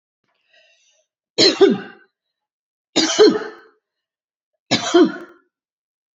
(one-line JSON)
{"three_cough_length": "6.1 s", "three_cough_amplitude": 29102, "three_cough_signal_mean_std_ratio": 0.34, "survey_phase": "beta (2021-08-13 to 2022-03-07)", "age": "65+", "gender": "Female", "wearing_mask": "No", "symptom_cough_any": true, "symptom_runny_or_blocked_nose": true, "symptom_onset": "5 days", "smoker_status": "Ex-smoker", "respiratory_condition_asthma": true, "respiratory_condition_other": false, "recruitment_source": "REACT", "submission_delay": "1 day", "covid_test_result": "Negative", "covid_test_method": "RT-qPCR", "influenza_a_test_result": "Negative", "influenza_b_test_result": "Negative"}